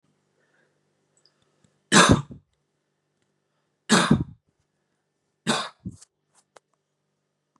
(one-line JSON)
{"three_cough_length": "7.6 s", "three_cough_amplitude": 28502, "three_cough_signal_mean_std_ratio": 0.24, "survey_phase": "beta (2021-08-13 to 2022-03-07)", "age": "18-44", "gender": "Male", "wearing_mask": "No", "symptom_runny_or_blocked_nose": true, "symptom_headache": true, "symptom_onset": "3 days", "smoker_status": "Never smoked", "respiratory_condition_asthma": true, "respiratory_condition_other": false, "recruitment_source": "Test and Trace", "submission_delay": "2 days", "covid_test_result": "Positive", "covid_test_method": "RT-qPCR", "covid_ct_value": 27.5, "covid_ct_gene": "ORF1ab gene"}